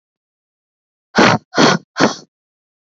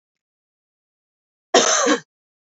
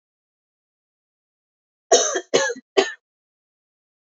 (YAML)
exhalation_length: 2.8 s
exhalation_amplitude: 32051
exhalation_signal_mean_std_ratio: 0.36
cough_length: 2.6 s
cough_amplitude: 27845
cough_signal_mean_std_ratio: 0.32
three_cough_length: 4.2 s
three_cough_amplitude: 28627
three_cough_signal_mean_std_ratio: 0.27
survey_phase: alpha (2021-03-01 to 2021-08-12)
age: 18-44
gender: Female
wearing_mask: 'No'
symptom_none: true
smoker_status: Ex-smoker
respiratory_condition_asthma: false
respiratory_condition_other: false
recruitment_source: REACT
submission_delay: 2 days
covid_test_result: Negative
covid_test_method: RT-qPCR